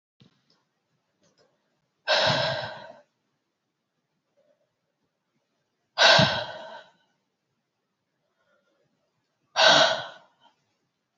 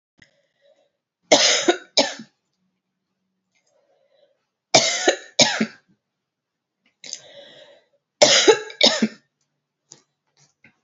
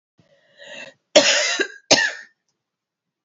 {"exhalation_length": "11.2 s", "exhalation_amplitude": 22355, "exhalation_signal_mean_std_ratio": 0.28, "three_cough_length": "10.8 s", "three_cough_amplitude": 32767, "three_cough_signal_mean_std_ratio": 0.3, "cough_length": "3.2 s", "cough_amplitude": 30321, "cough_signal_mean_std_ratio": 0.36, "survey_phase": "beta (2021-08-13 to 2022-03-07)", "age": "45-64", "gender": "Female", "wearing_mask": "No", "symptom_cough_any": true, "symptom_runny_or_blocked_nose": true, "symptom_sore_throat": true, "symptom_fever_high_temperature": true, "symptom_headache": true, "symptom_loss_of_taste": true, "symptom_onset": "3 days", "smoker_status": "Never smoked", "respiratory_condition_asthma": false, "respiratory_condition_other": false, "recruitment_source": "Test and Trace", "submission_delay": "2 days", "covid_test_result": "Positive", "covid_test_method": "ePCR"}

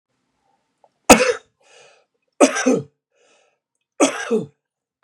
{"three_cough_length": "5.0 s", "three_cough_amplitude": 32768, "three_cough_signal_mean_std_ratio": 0.29, "survey_phase": "beta (2021-08-13 to 2022-03-07)", "age": "65+", "gender": "Male", "wearing_mask": "No", "symptom_sore_throat": true, "symptom_fatigue": true, "symptom_other": true, "symptom_onset": "11 days", "smoker_status": "Ex-smoker", "respiratory_condition_asthma": false, "respiratory_condition_other": false, "recruitment_source": "REACT", "submission_delay": "2 days", "covid_test_result": "Negative", "covid_test_method": "RT-qPCR", "influenza_a_test_result": "Negative", "influenza_b_test_result": "Negative"}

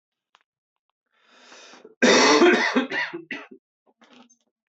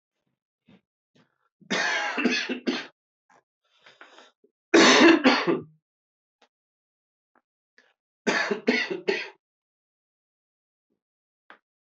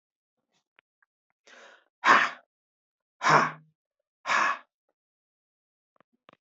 {"cough_length": "4.7 s", "cough_amplitude": 18633, "cough_signal_mean_std_ratio": 0.39, "three_cough_length": "11.9 s", "three_cough_amplitude": 19230, "three_cough_signal_mean_std_ratio": 0.32, "exhalation_length": "6.6 s", "exhalation_amplitude": 18872, "exhalation_signal_mean_std_ratio": 0.26, "survey_phase": "beta (2021-08-13 to 2022-03-07)", "age": "45-64", "gender": "Male", "wearing_mask": "No", "symptom_cough_any": true, "symptom_new_continuous_cough": true, "symptom_runny_or_blocked_nose": true, "symptom_diarrhoea": true, "symptom_fatigue": true, "symptom_fever_high_temperature": true, "symptom_onset": "4 days", "smoker_status": "Ex-smoker", "respiratory_condition_asthma": false, "respiratory_condition_other": false, "recruitment_source": "Test and Trace", "submission_delay": "1 day", "covid_test_result": "Positive", "covid_test_method": "RT-qPCR", "covid_ct_value": 11.9, "covid_ct_gene": "ORF1ab gene", "covid_ct_mean": 12.3, "covid_viral_load": "94000000 copies/ml", "covid_viral_load_category": "High viral load (>1M copies/ml)"}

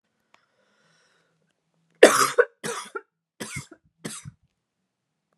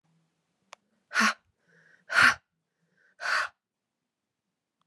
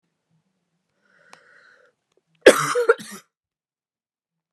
{"three_cough_length": "5.4 s", "three_cough_amplitude": 32768, "three_cough_signal_mean_std_ratio": 0.21, "exhalation_length": "4.9 s", "exhalation_amplitude": 17009, "exhalation_signal_mean_std_ratio": 0.27, "cough_length": "4.5 s", "cough_amplitude": 32768, "cough_signal_mean_std_ratio": 0.2, "survey_phase": "beta (2021-08-13 to 2022-03-07)", "age": "18-44", "gender": "Female", "wearing_mask": "No", "symptom_runny_or_blocked_nose": true, "symptom_onset": "12 days", "smoker_status": "Never smoked", "respiratory_condition_asthma": false, "respiratory_condition_other": false, "recruitment_source": "REACT", "submission_delay": "2 days", "covid_test_result": "Negative", "covid_test_method": "RT-qPCR", "influenza_a_test_result": "Negative", "influenza_b_test_result": "Negative"}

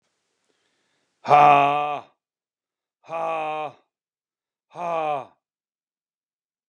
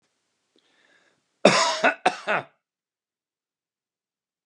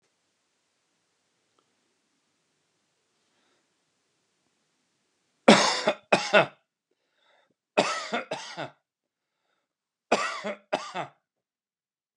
{"exhalation_length": "6.7 s", "exhalation_amplitude": 28128, "exhalation_signal_mean_std_ratio": 0.32, "cough_length": "4.5 s", "cough_amplitude": 30646, "cough_signal_mean_std_ratio": 0.27, "three_cough_length": "12.2 s", "three_cough_amplitude": 27531, "three_cough_signal_mean_std_ratio": 0.24, "survey_phase": "beta (2021-08-13 to 2022-03-07)", "age": "45-64", "gender": "Male", "wearing_mask": "No", "symptom_none": true, "smoker_status": "Ex-smoker", "respiratory_condition_asthma": false, "respiratory_condition_other": false, "recruitment_source": "REACT", "submission_delay": "2 days", "covid_test_result": "Negative", "covid_test_method": "RT-qPCR", "influenza_a_test_result": "Negative", "influenza_b_test_result": "Negative"}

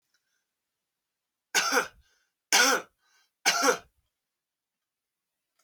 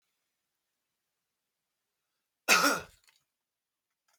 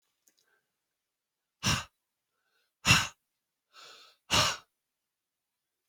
{"three_cough_length": "5.6 s", "three_cough_amplitude": 11783, "three_cough_signal_mean_std_ratio": 0.31, "cough_length": "4.2 s", "cough_amplitude": 13949, "cough_signal_mean_std_ratio": 0.21, "exhalation_length": "5.9 s", "exhalation_amplitude": 15410, "exhalation_signal_mean_std_ratio": 0.25, "survey_phase": "alpha (2021-03-01 to 2021-08-12)", "age": "18-44", "gender": "Male", "wearing_mask": "No", "symptom_none": true, "smoker_status": "Never smoked", "respiratory_condition_asthma": true, "respiratory_condition_other": false, "recruitment_source": "REACT", "submission_delay": "2 days", "covid_test_result": "Negative", "covid_test_method": "RT-qPCR"}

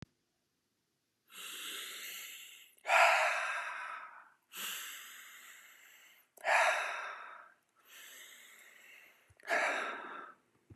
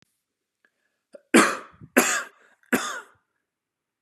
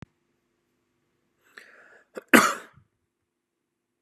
{"exhalation_length": "10.8 s", "exhalation_amplitude": 7880, "exhalation_signal_mean_std_ratio": 0.43, "three_cough_length": "4.0 s", "three_cough_amplitude": 29355, "three_cough_signal_mean_std_ratio": 0.29, "cough_length": "4.0 s", "cough_amplitude": 31289, "cough_signal_mean_std_ratio": 0.17, "survey_phase": "beta (2021-08-13 to 2022-03-07)", "age": "18-44", "gender": "Male", "wearing_mask": "No", "symptom_none": true, "smoker_status": "Ex-smoker", "respiratory_condition_asthma": false, "respiratory_condition_other": false, "recruitment_source": "REACT", "submission_delay": "2 days", "covid_test_result": "Negative", "covid_test_method": "RT-qPCR", "influenza_a_test_result": "Negative", "influenza_b_test_result": "Negative"}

